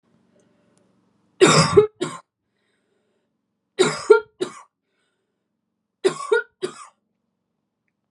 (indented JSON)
{
  "three_cough_length": "8.1 s",
  "three_cough_amplitude": 32376,
  "three_cough_signal_mean_std_ratio": 0.27,
  "survey_phase": "beta (2021-08-13 to 2022-03-07)",
  "age": "18-44",
  "gender": "Female",
  "wearing_mask": "No",
  "symptom_runny_or_blocked_nose": true,
  "symptom_fatigue": true,
  "symptom_change_to_sense_of_smell_or_taste": true,
  "symptom_loss_of_taste": true,
  "symptom_onset": "4 days",
  "smoker_status": "Never smoked",
  "respiratory_condition_asthma": false,
  "respiratory_condition_other": false,
  "recruitment_source": "Test and Trace",
  "submission_delay": "1 day",
  "covid_test_result": "Positive",
  "covid_test_method": "RT-qPCR"
}